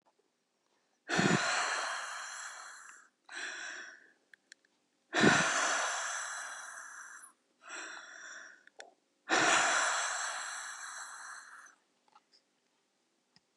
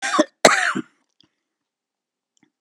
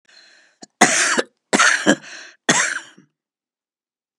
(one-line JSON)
{"exhalation_length": "13.6 s", "exhalation_amplitude": 9560, "exhalation_signal_mean_std_ratio": 0.49, "cough_length": "2.6 s", "cough_amplitude": 32768, "cough_signal_mean_std_ratio": 0.31, "three_cough_length": "4.2 s", "three_cough_amplitude": 32768, "three_cough_signal_mean_std_ratio": 0.4, "survey_phase": "beta (2021-08-13 to 2022-03-07)", "age": "65+", "gender": "Female", "wearing_mask": "No", "symptom_none": true, "smoker_status": "Never smoked", "respiratory_condition_asthma": false, "respiratory_condition_other": false, "recruitment_source": "REACT", "submission_delay": "1 day", "covid_test_result": "Negative", "covid_test_method": "RT-qPCR", "influenza_a_test_result": "Negative", "influenza_b_test_result": "Negative"}